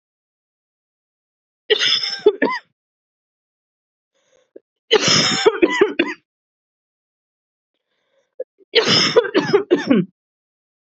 {
  "three_cough_length": "10.8 s",
  "three_cough_amplitude": 32767,
  "three_cough_signal_mean_std_ratio": 0.38,
  "survey_phase": "beta (2021-08-13 to 2022-03-07)",
  "age": "18-44",
  "gender": "Female",
  "wearing_mask": "No",
  "symptom_runny_or_blocked_nose": true,
  "symptom_shortness_of_breath": true,
  "symptom_fatigue": true,
  "symptom_change_to_sense_of_smell_or_taste": true,
  "symptom_onset": "4 days",
  "smoker_status": "Ex-smoker",
  "respiratory_condition_asthma": false,
  "respiratory_condition_other": false,
  "recruitment_source": "Test and Trace",
  "submission_delay": "2 days",
  "covid_test_result": "Positive",
  "covid_test_method": "RT-qPCR",
  "covid_ct_value": 20.8,
  "covid_ct_gene": "ORF1ab gene",
  "covid_ct_mean": 21.6,
  "covid_viral_load": "83000 copies/ml",
  "covid_viral_load_category": "Low viral load (10K-1M copies/ml)"
}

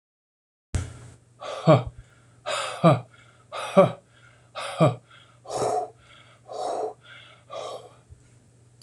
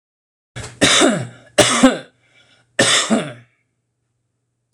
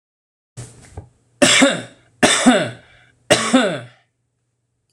{
  "exhalation_length": "8.8 s",
  "exhalation_amplitude": 25326,
  "exhalation_signal_mean_std_ratio": 0.35,
  "cough_length": "4.7 s",
  "cough_amplitude": 26028,
  "cough_signal_mean_std_ratio": 0.42,
  "three_cough_length": "4.9 s",
  "three_cough_amplitude": 26028,
  "three_cough_signal_mean_std_ratio": 0.41,
  "survey_phase": "alpha (2021-03-01 to 2021-08-12)",
  "age": "45-64",
  "gender": "Male",
  "wearing_mask": "No",
  "symptom_none": true,
  "smoker_status": "Never smoked",
  "respiratory_condition_asthma": false,
  "respiratory_condition_other": false,
  "recruitment_source": "REACT",
  "submission_delay": "3 days",
  "covid_test_result": "Negative",
  "covid_test_method": "RT-qPCR"
}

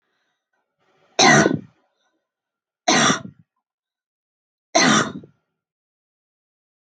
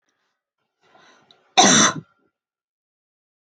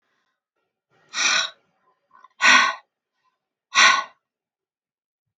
{
  "three_cough_length": "7.0 s",
  "three_cough_amplitude": 32522,
  "three_cough_signal_mean_std_ratio": 0.31,
  "cough_length": "3.4 s",
  "cough_amplitude": 31113,
  "cough_signal_mean_std_ratio": 0.27,
  "exhalation_length": "5.4 s",
  "exhalation_amplitude": 27180,
  "exhalation_signal_mean_std_ratio": 0.31,
  "survey_phase": "beta (2021-08-13 to 2022-03-07)",
  "age": "18-44",
  "gender": "Female",
  "wearing_mask": "No",
  "symptom_none": true,
  "smoker_status": "Ex-smoker",
  "respiratory_condition_asthma": false,
  "respiratory_condition_other": false,
  "recruitment_source": "REACT",
  "submission_delay": "4 days",
  "covid_test_result": "Negative",
  "covid_test_method": "RT-qPCR"
}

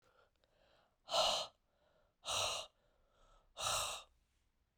{
  "exhalation_length": "4.8 s",
  "exhalation_amplitude": 2812,
  "exhalation_signal_mean_std_ratio": 0.41,
  "survey_phase": "beta (2021-08-13 to 2022-03-07)",
  "age": "45-64",
  "gender": "Female",
  "wearing_mask": "No",
  "symptom_cough_any": true,
  "symptom_runny_or_blocked_nose": true,
  "symptom_headache": true,
  "symptom_onset": "3 days",
  "smoker_status": "Never smoked",
  "respiratory_condition_asthma": false,
  "respiratory_condition_other": false,
  "recruitment_source": "Test and Trace",
  "submission_delay": "2 days",
  "covid_test_result": "Positive",
  "covid_test_method": "RT-qPCR",
  "covid_ct_value": 15.3,
  "covid_ct_gene": "N gene",
  "covid_ct_mean": 15.4,
  "covid_viral_load": "9100000 copies/ml",
  "covid_viral_load_category": "High viral load (>1M copies/ml)"
}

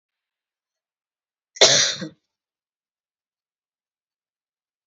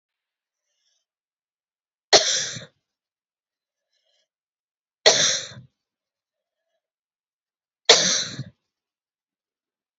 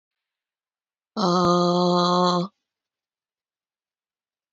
{
  "cough_length": "4.9 s",
  "cough_amplitude": 30594,
  "cough_signal_mean_std_ratio": 0.2,
  "three_cough_length": "10.0 s",
  "three_cough_amplitude": 30780,
  "three_cough_signal_mean_std_ratio": 0.23,
  "exhalation_length": "4.5 s",
  "exhalation_amplitude": 14596,
  "exhalation_signal_mean_std_ratio": 0.44,
  "survey_phase": "beta (2021-08-13 to 2022-03-07)",
  "age": "18-44",
  "gender": "Female",
  "wearing_mask": "No",
  "symptom_cough_any": true,
  "symptom_runny_or_blocked_nose": true,
  "symptom_headache": true,
  "symptom_onset": "5 days",
  "smoker_status": "Ex-smoker",
  "respiratory_condition_asthma": false,
  "respiratory_condition_other": false,
  "recruitment_source": "Test and Trace",
  "submission_delay": "2 days",
  "covid_test_result": "Positive",
  "covid_test_method": "RT-qPCR"
}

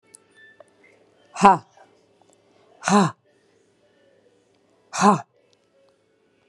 {
  "exhalation_length": "6.5 s",
  "exhalation_amplitude": 32767,
  "exhalation_signal_mean_std_ratio": 0.23,
  "survey_phase": "beta (2021-08-13 to 2022-03-07)",
  "age": "65+",
  "gender": "Female",
  "wearing_mask": "No",
  "symptom_none": true,
  "smoker_status": "Never smoked",
  "respiratory_condition_asthma": false,
  "respiratory_condition_other": false,
  "recruitment_source": "REACT",
  "submission_delay": "1 day",
  "covid_test_result": "Negative",
  "covid_test_method": "RT-qPCR",
  "influenza_a_test_result": "Unknown/Void",
  "influenza_b_test_result": "Unknown/Void"
}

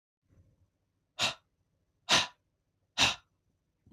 {
  "exhalation_length": "3.9 s",
  "exhalation_amplitude": 8959,
  "exhalation_signal_mean_std_ratio": 0.26,
  "survey_phase": "beta (2021-08-13 to 2022-03-07)",
  "age": "18-44",
  "gender": "Male",
  "wearing_mask": "No",
  "symptom_none": true,
  "smoker_status": "Never smoked",
  "respiratory_condition_asthma": false,
  "respiratory_condition_other": false,
  "recruitment_source": "Test and Trace",
  "submission_delay": "1 day",
  "covid_test_result": "Positive",
  "covid_test_method": "RT-qPCR",
  "covid_ct_value": 18.1,
  "covid_ct_gene": "ORF1ab gene",
  "covid_ct_mean": 18.5,
  "covid_viral_load": "830000 copies/ml",
  "covid_viral_load_category": "Low viral load (10K-1M copies/ml)"
}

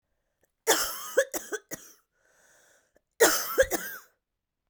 {
  "cough_length": "4.7 s",
  "cough_amplitude": 14430,
  "cough_signal_mean_std_ratio": 0.35,
  "survey_phase": "beta (2021-08-13 to 2022-03-07)",
  "age": "18-44",
  "gender": "Female",
  "wearing_mask": "No",
  "symptom_cough_any": true,
  "symptom_runny_or_blocked_nose": true,
  "symptom_headache": true,
  "symptom_change_to_sense_of_smell_or_taste": true,
  "symptom_loss_of_taste": true,
  "symptom_other": true,
  "smoker_status": "Current smoker (e-cigarettes or vapes only)",
  "respiratory_condition_asthma": false,
  "respiratory_condition_other": false,
  "recruitment_source": "Test and Trace",
  "submission_delay": "2 days",
  "covid_test_result": "Positive",
  "covid_test_method": "RT-qPCR",
  "covid_ct_value": 18.0,
  "covid_ct_gene": "ORF1ab gene",
  "covid_ct_mean": 18.4,
  "covid_viral_load": "920000 copies/ml",
  "covid_viral_load_category": "Low viral load (10K-1M copies/ml)"
}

